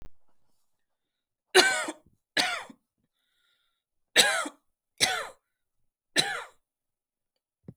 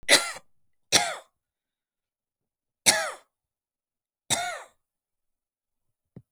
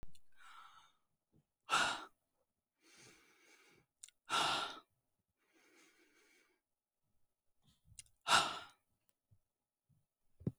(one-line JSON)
{"cough_length": "7.8 s", "cough_amplitude": 21678, "cough_signal_mean_std_ratio": 0.3, "three_cough_length": "6.3 s", "three_cough_amplitude": 29296, "three_cough_signal_mean_std_ratio": 0.26, "exhalation_length": "10.6 s", "exhalation_amplitude": 4719, "exhalation_signal_mean_std_ratio": 0.28, "survey_phase": "alpha (2021-03-01 to 2021-08-12)", "age": "18-44", "gender": "Female", "wearing_mask": "No", "symptom_shortness_of_breath": true, "symptom_headache": true, "symptom_onset": "12 days", "smoker_status": "Never smoked", "respiratory_condition_asthma": false, "respiratory_condition_other": false, "recruitment_source": "REACT", "submission_delay": "18 days", "covid_test_result": "Negative", "covid_test_method": "RT-qPCR"}